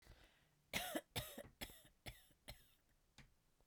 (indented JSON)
{
  "three_cough_length": "3.7 s",
  "three_cough_amplitude": 1354,
  "three_cough_signal_mean_std_ratio": 0.4,
  "survey_phase": "beta (2021-08-13 to 2022-03-07)",
  "age": "45-64",
  "gender": "Female",
  "wearing_mask": "No",
  "symptom_none": true,
  "smoker_status": "Ex-smoker",
  "respiratory_condition_asthma": false,
  "respiratory_condition_other": false,
  "recruitment_source": "REACT",
  "submission_delay": "1 day",
  "covid_test_result": "Negative",
  "covid_test_method": "RT-qPCR"
}